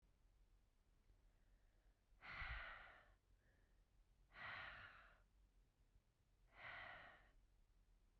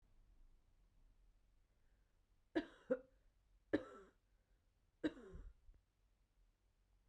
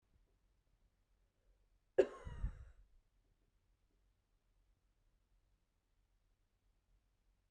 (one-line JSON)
{"exhalation_length": "8.2 s", "exhalation_amplitude": 330, "exhalation_signal_mean_std_ratio": 0.54, "three_cough_length": "7.1 s", "three_cough_amplitude": 2433, "three_cough_signal_mean_std_ratio": 0.24, "cough_length": "7.5 s", "cough_amplitude": 4149, "cough_signal_mean_std_ratio": 0.15, "survey_phase": "beta (2021-08-13 to 2022-03-07)", "age": "18-44", "gender": "Female", "wearing_mask": "No", "symptom_none": true, "symptom_onset": "3 days", "smoker_status": "Ex-smoker", "respiratory_condition_asthma": false, "respiratory_condition_other": false, "recruitment_source": "REACT", "submission_delay": "1 day", "covid_test_result": "Negative", "covid_test_method": "RT-qPCR", "influenza_a_test_result": "Negative", "influenza_b_test_result": "Negative"}